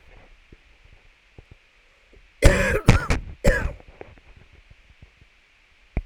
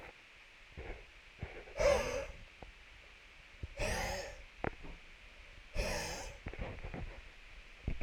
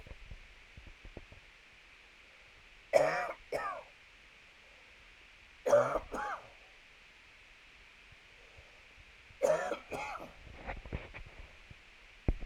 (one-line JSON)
{"cough_length": "6.1 s", "cough_amplitude": 32768, "cough_signal_mean_std_ratio": 0.3, "exhalation_length": "8.0 s", "exhalation_amplitude": 4238, "exhalation_signal_mean_std_ratio": 0.57, "three_cough_length": "12.5 s", "three_cough_amplitude": 9214, "three_cough_signal_mean_std_ratio": 0.38, "survey_phase": "alpha (2021-03-01 to 2021-08-12)", "age": "45-64", "gender": "Male", "wearing_mask": "No", "symptom_cough_any": true, "symptom_change_to_sense_of_smell_or_taste": true, "symptom_loss_of_taste": true, "smoker_status": "Current smoker (1 to 10 cigarettes per day)", "respiratory_condition_asthma": false, "respiratory_condition_other": false, "recruitment_source": "Test and Trace", "submission_delay": "2 days", "covid_test_result": "Positive", "covid_test_method": "RT-qPCR", "covid_ct_value": 15.2, "covid_ct_gene": "ORF1ab gene", "covid_ct_mean": 16.0, "covid_viral_load": "5500000 copies/ml", "covid_viral_load_category": "High viral load (>1M copies/ml)"}